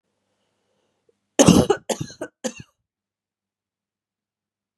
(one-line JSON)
{"three_cough_length": "4.8 s", "three_cough_amplitude": 32746, "three_cough_signal_mean_std_ratio": 0.22, "survey_phase": "beta (2021-08-13 to 2022-03-07)", "age": "18-44", "gender": "Female", "wearing_mask": "No", "symptom_cough_any": true, "symptom_runny_or_blocked_nose": true, "symptom_sore_throat": true, "symptom_fatigue": true, "symptom_headache": true, "symptom_change_to_sense_of_smell_or_taste": true, "symptom_loss_of_taste": true, "symptom_onset": "3 days", "smoker_status": "Ex-smoker", "respiratory_condition_asthma": false, "respiratory_condition_other": false, "recruitment_source": "Test and Trace", "submission_delay": "2 days", "covid_test_result": "Positive", "covid_test_method": "RT-qPCR"}